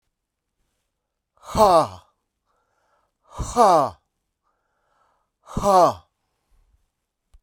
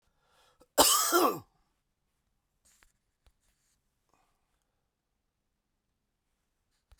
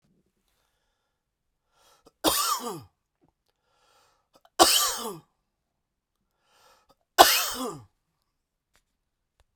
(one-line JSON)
{"exhalation_length": "7.4 s", "exhalation_amplitude": 26242, "exhalation_signal_mean_std_ratio": 0.3, "cough_length": "7.0 s", "cough_amplitude": 16505, "cough_signal_mean_std_ratio": 0.22, "three_cough_length": "9.6 s", "three_cough_amplitude": 32768, "three_cough_signal_mean_std_ratio": 0.25, "survey_phase": "beta (2021-08-13 to 2022-03-07)", "age": "45-64", "gender": "Male", "wearing_mask": "No", "symptom_cough_any": true, "symptom_runny_or_blocked_nose": true, "symptom_headache": true, "symptom_onset": "3 days", "smoker_status": "Never smoked", "respiratory_condition_asthma": false, "respiratory_condition_other": false, "recruitment_source": "Test and Trace", "submission_delay": "2 days", "covid_test_result": "Positive", "covid_test_method": "RT-qPCR", "covid_ct_value": 16.1, "covid_ct_gene": "ORF1ab gene", "covid_ct_mean": 16.6, "covid_viral_load": "3500000 copies/ml", "covid_viral_load_category": "High viral load (>1M copies/ml)"}